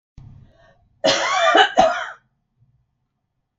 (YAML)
cough_length: 3.6 s
cough_amplitude: 31525
cough_signal_mean_std_ratio: 0.41
survey_phase: beta (2021-08-13 to 2022-03-07)
age: 65+
gender: Female
wearing_mask: 'No'
symptom_none: true
smoker_status: Never smoked
respiratory_condition_asthma: false
respiratory_condition_other: false
recruitment_source: REACT
submission_delay: 2 days
covid_test_result: Negative
covid_test_method: RT-qPCR
influenza_a_test_result: Negative
influenza_b_test_result: Negative